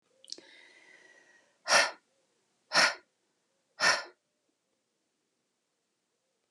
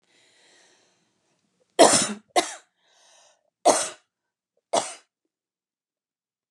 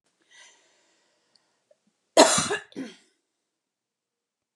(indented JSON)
{
  "exhalation_length": "6.5 s",
  "exhalation_amplitude": 11674,
  "exhalation_signal_mean_std_ratio": 0.25,
  "three_cough_length": "6.5 s",
  "three_cough_amplitude": 28731,
  "three_cough_signal_mean_std_ratio": 0.24,
  "cough_length": "4.6 s",
  "cough_amplitude": 30828,
  "cough_signal_mean_std_ratio": 0.21,
  "survey_phase": "alpha (2021-03-01 to 2021-08-12)",
  "age": "45-64",
  "gender": "Female",
  "wearing_mask": "No",
  "symptom_none": true,
  "smoker_status": "Ex-smoker",
  "respiratory_condition_asthma": false,
  "respiratory_condition_other": false,
  "recruitment_source": "REACT",
  "submission_delay": "1 day",
  "covid_test_result": "Negative",
  "covid_test_method": "RT-qPCR"
}